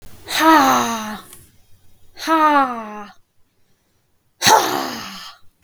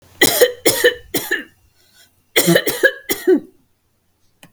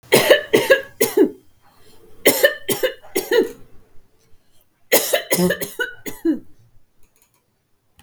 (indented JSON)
{
  "exhalation_length": "5.6 s",
  "exhalation_amplitude": 32768,
  "exhalation_signal_mean_std_ratio": 0.48,
  "cough_length": "4.5 s",
  "cough_amplitude": 32768,
  "cough_signal_mean_std_ratio": 0.44,
  "three_cough_length": "8.0 s",
  "three_cough_amplitude": 32768,
  "three_cough_signal_mean_std_ratio": 0.44,
  "survey_phase": "beta (2021-08-13 to 2022-03-07)",
  "age": "18-44",
  "gender": "Female",
  "wearing_mask": "No",
  "symptom_other": true,
  "smoker_status": "Never smoked",
  "respiratory_condition_asthma": false,
  "respiratory_condition_other": false,
  "recruitment_source": "Test and Trace",
  "submission_delay": "3 days",
  "covid_test_result": "Negative",
  "covid_test_method": "ePCR"
}